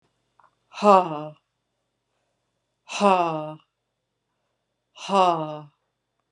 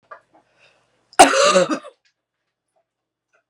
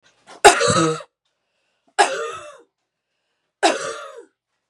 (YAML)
exhalation_length: 6.3 s
exhalation_amplitude: 27559
exhalation_signal_mean_std_ratio: 0.3
cough_length: 3.5 s
cough_amplitude: 32768
cough_signal_mean_std_ratio: 0.29
three_cough_length: 4.7 s
three_cough_amplitude: 32768
three_cough_signal_mean_std_ratio: 0.34
survey_phase: beta (2021-08-13 to 2022-03-07)
age: 45-64
gender: Female
wearing_mask: 'No'
symptom_cough_any: true
symptom_runny_or_blocked_nose: true
symptom_headache: true
symptom_other: true
symptom_onset: 2 days
smoker_status: Ex-smoker
respiratory_condition_asthma: false
respiratory_condition_other: false
recruitment_source: Test and Trace
submission_delay: 1 day
covid_test_result: Positive
covid_test_method: RT-qPCR
covid_ct_value: 27.2
covid_ct_gene: ORF1ab gene